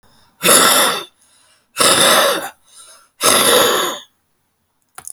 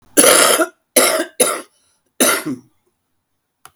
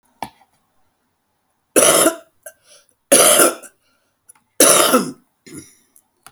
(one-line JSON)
{"exhalation_length": "5.1 s", "exhalation_amplitude": 32768, "exhalation_signal_mean_std_ratio": 0.54, "cough_length": "3.8 s", "cough_amplitude": 32768, "cough_signal_mean_std_ratio": 0.46, "three_cough_length": "6.3 s", "three_cough_amplitude": 32768, "three_cough_signal_mean_std_ratio": 0.37, "survey_phase": "beta (2021-08-13 to 2022-03-07)", "age": "65+", "gender": "Female", "wearing_mask": "No", "symptom_cough_any": true, "symptom_shortness_of_breath": true, "smoker_status": "Ex-smoker", "respiratory_condition_asthma": false, "respiratory_condition_other": true, "recruitment_source": "REACT", "submission_delay": "1 day", "covid_test_result": "Negative", "covid_test_method": "RT-qPCR"}